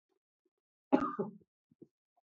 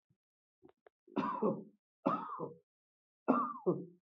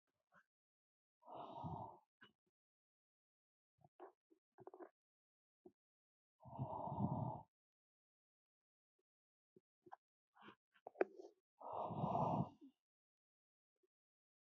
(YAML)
cough_length: 2.3 s
cough_amplitude: 8368
cough_signal_mean_std_ratio: 0.24
three_cough_length: 4.1 s
three_cough_amplitude: 6442
three_cough_signal_mean_std_ratio: 0.43
exhalation_length: 14.5 s
exhalation_amplitude: 2393
exhalation_signal_mean_std_ratio: 0.31
survey_phase: beta (2021-08-13 to 2022-03-07)
age: 18-44
gender: Male
wearing_mask: 'No'
symptom_none: true
smoker_status: Ex-smoker
respiratory_condition_asthma: false
respiratory_condition_other: false
recruitment_source: REACT
submission_delay: 1 day
covid_test_result: Negative
covid_test_method: RT-qPCR
influenza_a_test_result: Negative
influenza_b_test_result: Negative